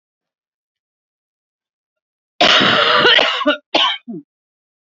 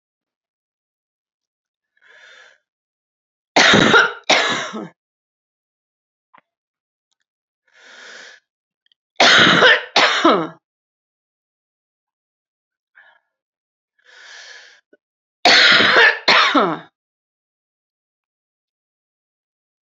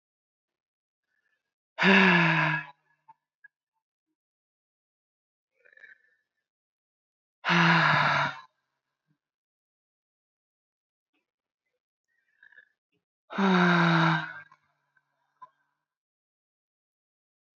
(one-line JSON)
{"cough_length": "4.9 s", "cough_amplitude": 29648, "cough_signal_mean_std_ratio": 0.44, "three_cough_length": "19.9 s", "three_cough_amplitude": 32768, "three_cough_signal_mean_std_ratio": 0.32, "exhalation_length": "17.6 s", "exhalation_amplitude": 14662, "exhalation_signal_mean_std_ratio": 0.31, "survey_phase": "beta (2021-08-13 to 2022-03-07)", "age": "45-64", "gender": "Female", "wearing_mask": "No", "symptom_cough_any": true, "symptom_runny_or_blocked_nose": true, "symptom_fatigue": true, "symptom_headache": true, "symptom_change_to_sense_of_smell_or_taste": true, "symptom_loss_of_taste": true, "symptom_onset": "7 days", "smoker_status": "Ex-smoker", "respiratory_condition_asthma": true, "respiratory_condition_other": false, "recruitment_source": "Test and Trace", "submission_delay": "2 days", "covid_test_result": "Positive", "covid_test_method": "RT-qPCR", "covid_ct_value": 15.3, "covid_ct_gene": "S gene", "covid_ct_mean": 15.6, "covid_viral_load": "7700000 copies/ml", "covid_viral_load_category": "High viral load (>1M copies/ml)"}